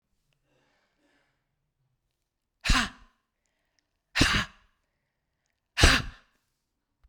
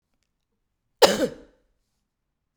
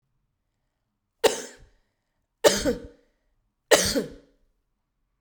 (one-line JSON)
{"exhalation_length": "7.1 s", "exhalation_amplitude": 22816, "exhalation_signal_mean_std_ratio": 0.24, "cough_length": "2.6 s", "cough_amplitude": 32767, "cough_signal_mean_std_ratio": 0.21, "three_cough_length": "5.2 s", "three_cough_amplitude": 32767, "three_cough_signal_mean_std_ratio": 0.27, "survey_phase": "beta (2021-08-13 to 2022-03-07)", "age": "45-64", "gender": "Female", "wearing_mask": "No", "symptom_none": true, "smoker_status": "Ex-smoker", "respiratory_condition_asthma": false, "respiratory_condition_other": false, "recruitment_source": "REACT", "submission_delay": "1 day", "covid_test_result": "Negative", "covid_test_method": "RT-qPCR"}